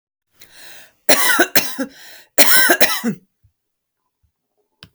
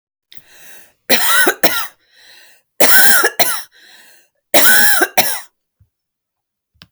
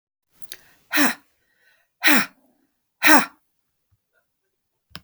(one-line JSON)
{"cough_length": "4.9 s", "cough_amplitude": 32768, "cough_signal_mean_std_ratio": 0.39, "three_cough_length": "6.9 s", "three_cough_amplitude": 32768, "three_cough_signal_mean_std_ratio": 0.45, "exhalation_length": "5.0 s", "exhalation_amplitude": 32768, "exhalation_signal_mean_std_ratio": 0.27, "survey_phase": "alpha (2021-03-01 to 2021-08-12)", "age": "45-64", "gender": "Female", "wearing_mask": "No", "symptom_none": true, "smoker_status": "Never smoked", "respiratory_condition_asthma": false, "respiratory_condition_other": false, "recruitment_source": "REACT", "submission_delay": "1 day", "covid_test_result": "Negative", "covid_test_method": "RT-qPCR"}